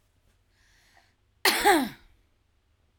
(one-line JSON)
{"cough_length": "3.0 s", "cough_amplitude": 12901, "cough_signal_mean_std_ratio": 0.3, "survey_phase": "alpha (2021-03-01 to 2021-08-12)", "age": "45-64", "gender": "Female", "wearing_mask": "No", "symptom_none": true, "smoker_status": "Ex-smoker", "respiratory_condition_asthma": true, "respiratory_condition_other": false, "recruitment_source": "REACT", "submission_delay": "4 days", "covid_test_result": "Negative", "covid_test_method": "RT-qPCR"}